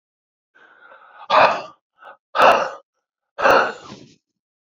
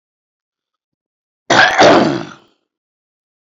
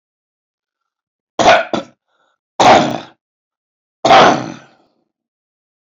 exhalation_length: 4.6 s
exhalation_amplitude: 31980
exhalation_signal_mean_std_ratio: 0.37
cough_length: 3.5 s
cough_amplitude: 31209
cough_signal_mean_std_ratio: 0.37
three_cough_length: 5.9 s
three_cough_amplitude: 29994
three_cough_signal_mean_std_ratio: 0.35
survey_phase: beta (2021-08-13 to 2022-03-07)
age: 65+
gender: Male
wearing_mask: 'No'
symptom_runny_or_blocked_nose: true
symptom_shortness_of_breath: true
smoker_status: Ex-smoker
respiratory_condition_asthma: false
respiratory_condition_other: true
recruitment_source: REACT
submission_delay: 4 days
covid_test_result: Negative
covid_test_method: RT-qPCR
influenza_a_test_result: Negative
influenza_b_test_result: Negative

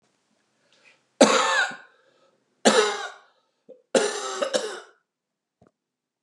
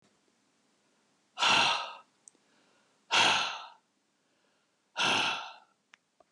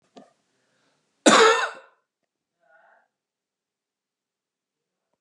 three_cough_length: 6.2 s
three_cough_amplitude: 28440
three_cough_signal_mean_std_ratio: 0.36
exhalation_length: 6.3 s
exhalation_amplitude: 7698
exhalation_signal_mean_std_ratio: 0.38
cough_length: 5.2 s
cough_amplitude: 30138
cough_signal_mean_std_ratio: 0.22
survey_phase: beta (2021-08-13 to 2022-03-07)
age: 65+
gender: Male
wearing_mask: 'No'
symptom_none: true
smoker_status: Ex-smoker
respiratory_condition_asthma: false
respiratory_condition_other: false
recruitment_source: REACT
submission_delay: 1 day
covid_test_result: Negative
covid_test_method: RT-qPCR
influenza_a_test_result: Negative
influenza_b_test_result: Negative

